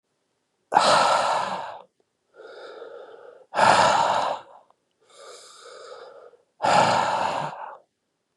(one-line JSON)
{"exhalation_length": "8.4 s", "exhalation_amplitude": 22585, "exhalation_signal_mean_std_ratio": 0.49, "survey_phase": "beta (2021-08-13 to 2022-03-07)", "age": "65+", "gender": "Male", "wearing_mask": "Yes", "symptom_cough_any": true, "symptom_runny_or_blocked_nose": true, "symptom_fatigue": true, "symptom_headache": true, "symptom_onset": "3 days", "smoker_status": "Never smoked", "respiratory_condition_asthma": false, "respiratory_condition_other": false, "recruitment_source": "Test and Trace", "submission_delay": "0 days", "covid_test_result": "Positive", "covid_test_method": "RT-qPCR", "covid_ct_value": 17.8, "covid_ct_gene": "ORF1ab gene", "covid_ct_mean": 18.0, "covid_viral_load": "1200000 copies/ml", "covid_viral_load_category": "High viral load (>1M copies/ml)"}